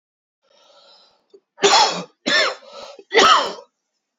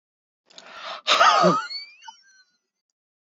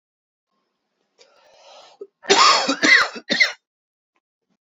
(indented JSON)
{
  "three_cough_length": "4.2 s",
  "three_cough_amplitude": 29755,
  "three_cough_signal_mean_std_ratio": 0.41,
  "exhalation_length": "3.2 s",
  "exhalation_amplitude": 21292,
  "exhalation_signal_mean_std_ratio": 0.39,
  "cough_length": "4.6 s",
  "cough_amplitude": 28930,
  "cough_signal_mean_std_ratio": 0.36,
  "survey_phase": "alpha (2021-03-01 to 2021-08-12)",
  "age": "18-44",
  "gender": "Male",
  "wearing_mask": "No",
  "symptom_cough_any": true,
  "symptom_diarrhoea": true,
  "symptom_fatigue": true,
  "symptom_fever_high_temperature": true,
  "symptom_headache": true,
  "symptom_change_to_sense_of_smell_or_taste": true,
  "symptom_loss_of_taste": true,
  "symptom_onset": "2 days",
  "smoker_status": "Never smoked",
  "respiratory_condition_asthma": false,
  "respiratory_condition_other": false,
  "recruitment_source": "Test and Trace",
  "submission_delay": "2 days",
  "covid_test_result": "Positive",
  "covid_test_method": "RT-qPCR",
  "covid_ct_value": 12.2,
  "covid_ct_gene": "ORF1ab gene",
  "covid_ct_mean": 12.9,
  "covid_viral_load": "60000000 copies/ml",
  "covid_viral_load_category": "High viral load (>1M copies/ml)"
}